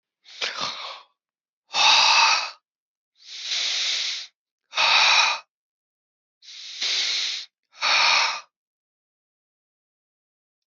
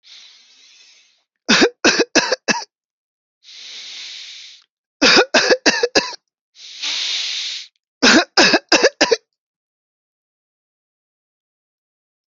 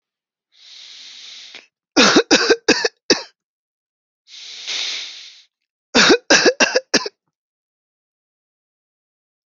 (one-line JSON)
{"exhalation_length": "10.7 s", "exhalation_amplitude": 22685, "exhalation_signal_mean_std_ratio": 0.47, "three_cough_length": "12.3 s", "three_cough_amplitude": 32767, "three_cough_signal_mean_std_ratio": 0.38, "cough_length": "9.5 s", "cough_amplitude": 32768, "cough_signal_mean_std_ratio": 0.34, "survey_phase": "alpha (2021-03-01 to 2021-08-12)", "age": "45-64", "gender": "Male", "wearing_mask": "No", "symptom_fatigue": true, "symptom_onset": "12 days", "smoker_status": "Never smoked", "respiratory_condition_asthma": false, "respiratory_condition_other": false, "recruitment_source": "REACT", "submission_delay": "1 day", "covid_test_result": "Negative", "covid_test_method": "RT-qPCR"}